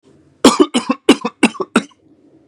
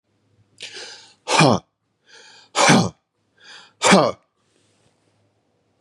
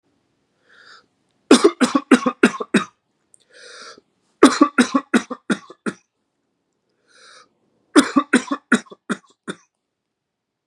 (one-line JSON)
{"cough_length": "2.5 s", "cough_amplitude": 32768, "cough_signal_mean_std_ratio": 0.36, "exhalation_length": "5.8 s", "exhalation_amplitude": 32164, "exhalation_signal_mean_std_ratio": 0.32, "three_cough_length": "10.7 s", "three_cough_amplitude": 32768, "three_cough_signal_mean_std_ratio": 0.29, "survey_phase": "beta (2021-08-13 to 2022-03-07)", "age": "45-64", "gender": "Male", "wearing_mask": "No", "symptom_cough_any": true, "smoker_status": "Never smoked", "respiratory_condition_asthma": false, "respiratory_condition_other": false, "recruitment_source": "REACT", "submission_delay": "1 day", "covid_test_result": "Negative", "covid_test_method": "RT-qPCR", "influenza_a_test_result": "Negative", "influenza_b_test_result": "Negative"}